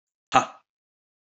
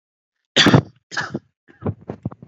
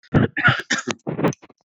{
  "exhalation_length": "1.3 s",
  "exhalation_amplitude": 26950,
  "exhalation_signal_mean_std_ratio": 0.2,
  "three_cough_length": "2.5 s",
  "three_cough_amplitude": 32746,
  "three_cough_signal_mean_std_ratio": 0.33,
  "cough_length": "1.7 s",
  "cough_amplitude": 26912,
  "cough_signal_mean_std_ratio": 0.52,
  "survey_phase": "alpha (2021-03-01 to 2021-08-12)",
  "age": "18-44",
  "gender": "Male",
  "wearing_mask": "No",
  "symptom_none": true,
  "smoker_status": "Current smoker (1 to 10 cigarettes per day)",
  "respiratory_condition_asthma": false,
  "respiratory_condition_other": false,
  "recruitment_source": "Test and Trace",
  "submission_delay": "0 days",
  "covid_test_result": "Negative",
  "covid_test_method": "LFT"
}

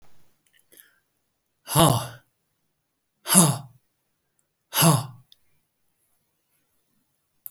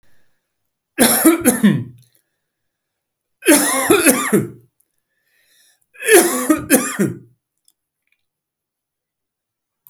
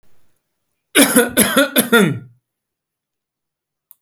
{
  "exhalation_length": "7.5 s",
  "exhalation_amplitude": 32767,
  "exhalation_signal_mean_std_ratio": 0.27,
  "three_cough_length": "9.9 s",
  "three_cough_amplitude": 32768,
  "three_cough_signal_mean_std_ratio": 0.4,
  "cough_length": "4.0 s",
  "cough_amplitude": 32768,
  "cough_signal_mean_std_ratio": 0.39,
  "survey_phase": "beta (2021-08-13 to 2022-03-07)",
  "age": "65+",
  "gender": "Male",
  "wearing_mask": "No",
  "symptom_none": true,
  "smoker_status": "Ex-smoker",
  "respiratory_condition_asthma": false,
  "respiratory_condition_other": false,
  "recruitment_source": "REACT",
  "submission_delay": "2 days",
  "covid_test_result": "Negative",
  "covid_test_method": "RT-qPCR"
}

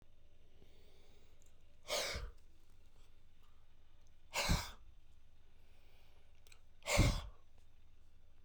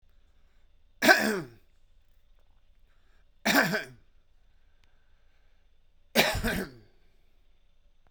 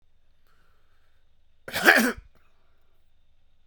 {
  "exhalation_length": "8.4 s",
  "exhalation_amplitude": 3450,
  "exhalation_signal_mean_std_ratio": 0.49,
  "three_cough_length": "8.1 s",
  "three_cough_amplitude": 19521,
  "three_cough_signal_mean_std_ratio": 0.31,
  "cough_length": "3.7 s",
  "cough_amplitude": 29205,
  "cough_signal_mean_std_ratio": 0.26,
  "survey_phase": "beta (2021-08-13 to 2022-03-07)",
  "age": "45-64",
  "gender": "Male",
  "wearing_mask": "No",
  "symptom_none": true,
  "symptom_onset": "9 days",
  "smoker_status": "Never smoked",
  "respiratory_condition_asthma": false,
  "respiratory_condition_other": false,
  "recruitment_source": "REACT",
  "submission_delay": "4 days",
  "covid_test_result": "Negative",
  "covid_test_method": "RT-qPCR"
}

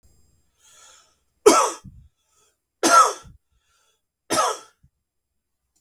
{
  "three_cough_length": "5.8 s",
  "three_cough_amplitude": 32766,
  "three_cough_signal_mean_std_ratio": 0.28,
  "survey_phase": "beta (2021-08-13 to 2022-03-07)",
  "age": "18-44",
  "gender": "Male",
  "wearing_mask": "No",
  "symptom_none": true,
  "smoker_status": "Ex-smoker",
  "respiratory_condition_asthma": true,
  "respiratory_condition_other": false,
  "recruitment_source": "Test and Trace",
  "submission_delay": "1 day",
  "covid_test_result": "Positive",
  "covid_test_method": "RT-qPCR",
  "covid_ct_value": 27.6,
  "covid_ct_gene": "ORF1ab gene"
}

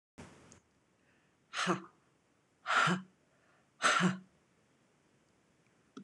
{
  "exhalation_length": "6.0 s",
  "exhalation_amplitude": 4871,
  "exhalation_signal_mean_std_ratio": 0.33,
  "survey_phase": "alpha (2021-03-01 to 2021-08-12)",
  "age": "45-64",
  "gender": "Female",
  "wearing_mask": "No",
  "symptom_none": true,
  "smoker_status": "Ex-smoker",
  "respiratory_condition_asthma": false,
  "respiratory_condition_other": false,
  "recruitment_source": "REACT",
  "submission_delay": "2 days",
  "covid_test_result": "Negative",
  "covid_test_method": "RT-qPCR"
}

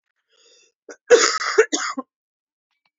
{
  "cough_length": "3.0 s",
  "cough_amplitude": 30067,
  "cough_signal_mean_std_ratio": 0.32,
  "survey_phase": "alpha (2021-03-01 to 2021-08-12)",
  "age": "18-44",
  "gender": "Female",
  "wearing_mask": "No",
  "symptom_cough_any": true,
  "symptom_new_continuous_cough": true,
  "symptom_shortness_of_breath": true,
  "symptom_fever_high_temperature": true,
  "symptom_headache": true,
  "symptom_change_to_sense_of_smell_or_taste": true,
  "smoker_status": "Ex-smoker",
  "respiratory_condition_asthma": false,
  "respiratory_condition_other": false,
  "recruitment_source": "Test and Trace",
  "submission_delay": "1 day",
  "covid_test_result": "Positive",
  "covid_test_method": "RT-qPCR",
  "covid_ct_value": 14.2,
  "covid_ct_gene": "ORF1ab gene",
  "covid_ct_mean": 15.3,
  "covid_viral_load": "9500000 copies/ml",
  "covid_viral_load_category": "High viral load (>1M copies/ml)"
}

